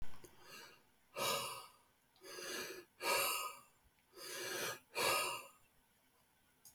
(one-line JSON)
{"exhalation_length": "6.7 s", "exhalation_amplitude": 2347, "exhalation_signal_mean_std_ratio": 0.55, "survey_phase": "beta (2021-08-13 to 2022-03-07)", "age": "45-64", "gender": "Male", "wearing_mask": "No", "symptom_cough_any": true, "symptom_runny_or_blocked_nose": true, "symptom_sore_throat": true, "symptom_fatigue": true, "symptom_headache": true, "symptom_change_to_sense_of_smell_or_taste": true, "symptom_loss_of_taste": true, "symptom_onset": "5 days", "smoker_status": "Ex-smoker", "respiratory_condition_asthma": false, "respiratory_condition_other": false, "recruitment_source": "REACT", "submission_delay": "0 days", "covid_test_result": "Negative", "covid_test_method": "RT-qPCR", "influenza_a_test_result": "Negative", "influenza_b_test_result": "Negative"}